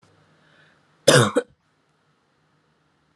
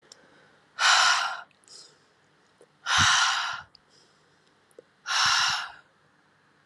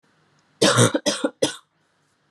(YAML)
cough_length: 3.2 s
cough_amplitude: 32687
cough_signal_mean_std_ratio: 0.23
exhalation_length: 6.7 s
exhalation_amplitude: 13034
exhalation_signal_mean_std_ratio: 0.44
three_cough_length: 2.3 s
three_cough_amplitude: 23095
three_cough_signal_mean_std_ratio: 0.4
survey_phase: alpha (2021-03-01 to 2021-08-12)
age: 18-44
gender: Female
wearing_mask: 'No'
symptom_fatigue: true
symptom_headache: true
smoker_status: Never smoked
respiratory_condition_asthma: false
respiratory_condition_other: false
recruitment_source: Test and Trace
submission_delay: 1 day
covid_test_result: Positive
covid_test_method: RT-qPCR